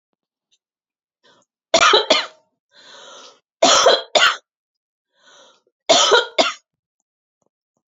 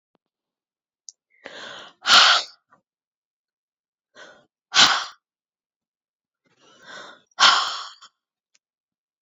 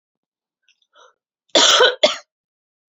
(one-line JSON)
{"three_cough_length": "7.9 s", "three_cough_amplitude": 31202, "three_cough_signal_mean_std_ratio": 0.35, "exhalation_length": "9.2 s", "exhalation_amplitude": 29689, "exhalation_signal_mean_std_ratio": 0.26, "cough_length": "2.9 s", "cough_amplitude": 32767, "cough_signal_mean_std_ratio": 0.33, "survey_phase": "beta (2021-08-13 to 2022-03-07)", "age": "45-64", "gender": "Female", "wearing_mask": "No", "symptom_none": true, "smoker_status": "Ex-smoker", "respiratory_condition_asthma": false, "respiratory_condition_other": false, "recruitment_source": "REACT", "submission_delay": "1 day", "covid_test_result": "Negative", "covid_test_method": "RT-qPCR", "influenza_a_test_result": "Negative", "influenza_b_test_result": "Negative"}